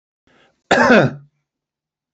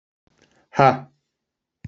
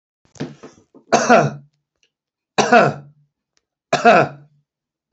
{"cough_length": "2.1 s", "cough_amplitude": 28303, "cough_signal_mean_std_ratio": 0.36, "exhalation_length": "1.9 s", "exhalation_amplitude": 28808, "exhalation_signal_mean_std_ratio": 0.24, "three_cough_length": "5.1 s", "three_cough_amplitude": 32767, "three_cough_signal_mean_std_ratio": 0.36, "survey_phase": "beta (2021-08-13 to 2022-03-07)", "age": "45-64", "gender": "Male", "wearing_mask": "No", "symptom_none": true, "smoker_status": "Ex-smoker", "respiratory_condition_asthma": false, "respiratory_condition_other": false, "recruitment_source": "REACT", "submission_delay": "2 days", "covid_test_result": "Negative", "covid_test_method": "RT-qPCR", "influenza_a_test_result": "Unknown/Void", "influenza_b_test_result": "Unknown/Void"}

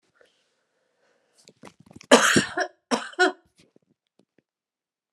{"cough_length": "5.1 s", "cough_amplitude": 32517, "cough_signal_mean_std_ratio": 0.26, "survey_phase": "alpha (2021-03-01 to 2021-08-12)", "age": "45-64", "gender": "Female", "wearing_mask": "No", "symptom_none": true, "smoker_status": "Ex-smoker", "respiratory_condition_asthma": true, "respiratory_condition_other": false, "recruitment_source": "REACT", "submission_delay": "3 days", "covid_test_result": "Negative", "covid_test_method": "RT-qPCR"}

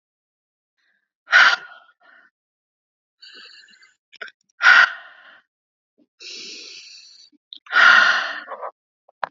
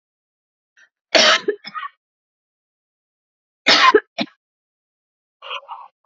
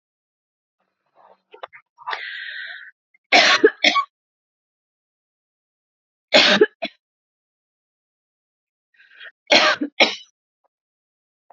{"exhalation_length": "9.3 s", "exhalation_amplitude": 28775, "exhalation_signal_mean_std_ratio": 0.3, "cough_length": "6.1 s", "cough_amplitude": 31771, "cough_signal_mean_std_ratio": 0.28, "three_cough_length": "11.5 s", "three_cough_amplitude": 32768, "three_cough_signal_mean_std_ratio": 0.28, "survey_phase": "alpha (2021-03-01 to 2021-08-12)", "age": "45-64", "gender": "Female", "wearing_mask": "No", "symptom_cough_any": true, "symptom_fatigue": true, "symptom_headache": true, "smoker_status": "Never smoked", "respiratory_condition_asthma": false, "respiratory_condition_other": false, "recruitment_source": "Test and Trace", "submission_delay": "3 days", "covid_test_result": "Positive", "covid_test_method": "RT-qPCR", "covid_ct_value": 18.6, "covid_ct_gene": "N gene", "covid_ct_mean": 19.2, "covid_viral_load": "490000 copies/ml", "covid_viral_load_category": "Low viral load (10K-1M copies/ml)"}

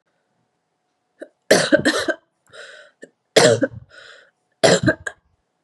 {"three_cough_length": "5.6 s", "three_cough_amplitude": 32767, "three_cough_signal_mean_std_ratio": 0.34, "survey_phase": "beta (2021-08-13 to 2022-03-07)", "age": "18-44", "gender": "Female", "wearing_mask": "No", "symptom_runny_or_blocked_nose": true, "smoker_status": "Never smoked", "respiratory_condition_asthma": false, "respiratory_condition_other": false, "recruitment_source": "REACT", "submission_delay": "2 days", "covid_test_result": "Negative", "covid_test_method": "RT-qPCR", "influenza_a_test_result": "Negative", "influenza_b_test_result": "Negative"}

